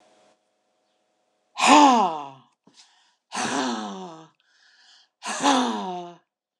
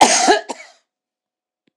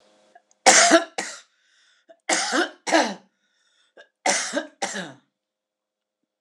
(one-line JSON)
{"exhalation_length": "6.6 s", "exhalation_amplitude": 26028, "exhalation_signal_mean_std_ratio": 0.38, "cough_length": "1.8 s", "cough_amplitude": 26028, "cough_signal_mean_std_ratio": 0.39, "three_cough_length": "6.4 s", "three_cough_amplitude": 26028, "three_cough_signal_mean_std_ratio": 0.35, "survey_phase": "alpha (2021-03-01 to 2021-08-12)", "age": "65+", "gender": "Female", "wearing_mask": "No", "symptom_none": true, "smoker_status": "Never smoked", "respiratory_condition_asthma": false, "respiratory_condition_other": false, "recruitment_source": "REACT", "submission_delay": "2 days", "covid_test_result": "Negative", "covid_test_method": "RT-qPCR"}